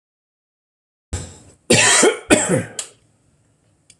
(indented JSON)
{
  "cough_length": "4.0 s",
  "cough_amplitude": 26028,
  "cough_signal_mean_std_ratio": 0.38,
  "survey_phase": "beta (2021-08-13 to 2022-03-07)",
  "age": "65+",
  "gender": "Male",
  "wearing_mask": "No",
  "symptom_none": true,
  "smoker_status": "Never smoked",
  "respiratory_condition_asthma": false,
  "respiratory_condition_other": false,
  "recruitment_source": "REACT",
  "submission_delay": "1 day",
  "covid_test_result": "Negative",
  "covid_test_method": "RT-qPCR"
}